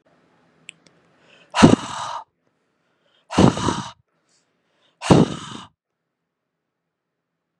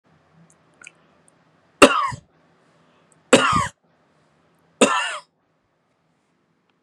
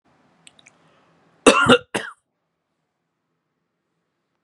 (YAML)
exhalation_length: 7.6 s
exhalation_amplitude: 32768
exhalation_signal_mean_std_ratio: 0.26
three_cough_length: 6.8 s
three_cough_amplitude: 32768
three_cough_signal_mean_std_ratio: 0.26
cough_length: 4.4 s
cough_amplitude: 32767
cough_signal_mean_std_ratio: 0.22
survey_phase: beta (2021-08-13 to 2022-03-07)
age: 18-44
gender: Male
wearing_mask: 'No'
symptom_none: true
smoker_status: Never smoked
respiratory_condition_asthma: false
respiratory_condition_other: false
recruitment_source: REACT
submission_delay: 3 days
covid_test_result: Negative
covid_test_method: RT-qPCR
influenza_a_test_result: Negative
influenza_b_test_result: Negative